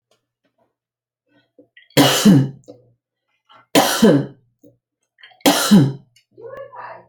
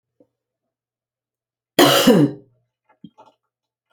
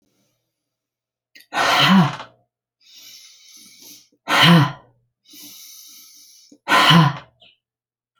{"three_cough_length": "7.1 s", "three_cough_amplitude": 32586, "three_cough_signal_mean_std_ratio": 0.37, "cough_length": "3.9 s", "cough_amplitude": 32768, "cough_signal_mean_std_ratio": 0.3, "exhalation_length": "8.2 s", "exhalation_amplitude": 29293, "exhalation_signal_mean_std_ratio": 0.36, "survey_phase": "alpha (2021-03-01 to 2021-08-12)", "age": "65+", "gender": "Female", "wearing_mask": "No", "symptom_change_to_sense_of_smell_or_taste": true, "smoker_status": "Ex-smoker", "respiratory_condition_asthma": false, "respiratory_condition_other": false, "recruitment_source": "REACT", "submission_delay": "1 day", "covid_test_result": "Negative", "covid_test_method": "RT-qPCR"}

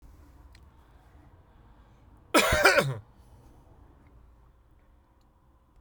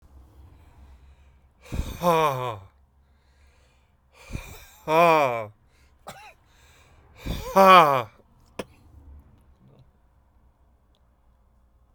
{"cough_length": "5.8 s", "cough_amplitude": 17545, "cough_signal_mean_std_ratio": 0.29, "exhalation_length": "11.9 s", "exhalation_amplitude": 31923, "exhalation_signal_mean_std_ratio": 0.3, "survey_phase": "beta (2021-08-13 to 2022-03-07)", "age": "45-64", "gender": "Male", "wearing_mask": "No", "symptom_change_to_sense_of_smell_or_taste": true, "symptom_loss_of_taste": true, "smoker_status": "Ex-smoker", "respiratory_condition_asthma": false, "respiratory_condition_other": false, "recruitment_source": "REACT", "submission_delay": "1 day", "covid_test_result": "Negative", "covid_test_method": "RT-qPCR"}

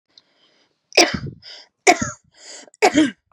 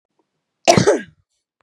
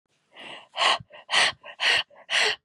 {"three_cough_length": "3.3 s", "three_cough_amplitude": 32768, "three_cough_signal_mean_std_ratio": 0.34, "cough_length": "1.6 s", "cough_amplitude": 32768, "cough_signal_mean_std_ratio": 0.33, "exhalation_length": "2.6 s", "exhalation_amplitude": 14563, "exhalation_signal_mean_std_ratio": 0.52, "survey_phase": "beta (2021-08-13 to 2022-03-07)", "age": "18-44", "gender": "Female", "wearing_mask": "Prefer not to say", "symptom_none": true, "smoker_status": "Ex-smoker", "respiratory_condition_asthma": false, "respiratory_condition_other": false, "recruitment_source": "REACT", "submission_delay": "4 days", "covid_test_result": "Negative", "covid_test_method": "RT-qPCR", "influenza_a_test_result": "Negative", "influenza_b_test_result": "Negative"}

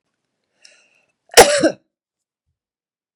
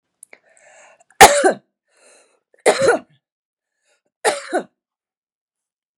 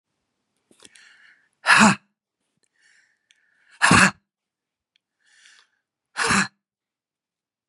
{"cough_length": "3.2 s", "cough_amplitude": 32768, "cough_signal_mean_std_ratio": 0.22, "three_cough_length": "6.0 s", "three_cough_amplitude": 32768, "three_cough_signal_mean_std_ratio": 0.26, "exhalation_length": "7.7 s", "exhalation_amplitude": 31774, "exhalation_signal_mean_std_ratio": 0.26, "survey_phase": "beta (2021-08-13 to 2022-03-07)", "age": "45-64", "gender": "Female", "wearing_mask": "No", "symptom_none": true, "smoker_status": "Current smoker (1 to 10 cigarettes per day)", "respiratory_condition_asthma": false, "respiratory_condition_other": false, "recruitment_source": "REACT", "submission_delay": "2 days", "covid_test_result": "Negative", "covid_test_method": "RT-qPCR", "influenza_a_test_result": "Negative", "influenza_b_test_result": "Negative"}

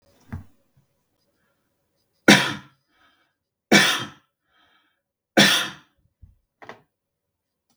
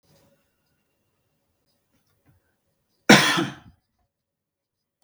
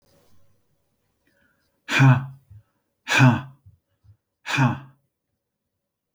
{"three_cough_length": "7.8 s", "three_cough_amplitude": 32768, "three_cough_signal_mean_std_ratio": 0.25, "cough_length": "5.0 s", "cough_amplitude": 32768, "cough_signal_mean_std_ratio": 0.19, "exhalation_length": "6.1 s", "exhalation_amplitude": 22650, "exhalation_signal_mean_std_ratio": 0.3, "survey_phase": "beta (2021-08-13 to 2022-03-07)", "age": "45-64", "gender": "Male", "wearing_mask": "No", "symptom_none": true, "smoker_status": "Never smoked", "respiratory_condition_asthma": false, "respiratory_condition_other": false, "recruitment_source": "REACT", "submission_delay": "1 day", "covid_test_result": "Negative", "covid_test_method": "RT-qPCR", "influenza_a_test_result": "Unknown/Void", "influenza_b_test_result": "Unknown/Void"}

